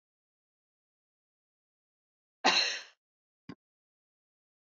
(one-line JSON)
{"cough_length": "4.8 s", "cough_amplitude": 9746, "cough_signal_mean_std_ratio": 0.2, "survey_phase": "beta (2021-08-13 to 2022-03-07)", "age": "45-64", "gender": "Female", "wearing_mask": "No", "symptom_none": true, "smoker_status": "Never smoked", "respiratory_condition_asthma": false, "respiratory_condition_other": false, "recruitment_source": "REACT", "submission_delay": "1 day", "covid_test_result": "Negative", "covid_test_method": "RT-qPCR"}